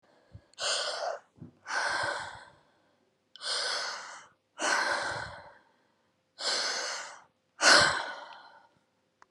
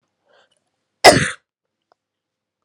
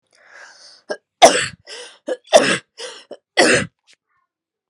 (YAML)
exhalation_length: 9.3 s
exhalation_amplitude: 15789
exhalation_signal_mean_std_ratio: 0.47
cough_length: 2.6 s
cough_amplitude: 32768
cough_signal_mean_std_ratio: 0.21
three_cough_length: 4.7 s
three_cough_amplitude: 32768
three_cough_signal_mean_std_ratio: 0.32
survey_phase: alpha (2021-03-01 to 2021-08-12)
age: 45-64
gender: Female
wearing_mask: 'Yes'
symptom_none: true
smoker_status: Never smoked
respiratory_condition_asthma: false
respiratory_condition_other: false
recruitment_source: REACT
submission_delay: 1 day
covid_test_result: Negative
covid_test_method: RT-qPCR